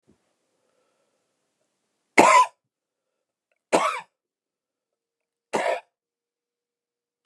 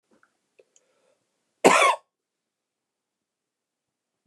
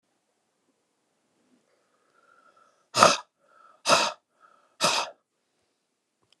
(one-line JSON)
{"three_cough_length": "7.3 s", "three_cough_amplitude": 29204, "three_cough_signal_mean_std_ratio": 0.23, "cough_length": "4.3 s", "cough_amplitude": 27799, "cough_signal_mean_std_ratio": 0.21, "exhalation_length": "6.4 s", "exhalation_amplitude": 29204, "exhalation_signal_mean_std_ratio": 0.24, "survey_phase": "beta (2021-08-13 to 2022-03-07)", "age": "45-64", "gender": "Male", "wearing_mask": "No", "symptom_cough_any": true, "symptom_runny_or_blocked_nose": true, "symptom_fatigue": true, "symptom_change_to_sense_of_smell_or_taste": true, "symptom_loss_of_taste": true, "smoker_status": "Never smoked", "respiratory_condition_asthma": false, "respiratory_condition_other": false, "recruitment_source": "Test and Trace", "submission_delay": "2 days", "covid_test_result": "Positive", "covid_test_method": "RT-qPCR", "covid_ct_value": 26.0, "covid_ct_gene": "ORF1ab gene", "covid_ct_mean": 26.9, "covid_viral_load": "1500 copies/ml", "covid_viral_load_category": "Minimal viral load (< 10K copies/ml)"}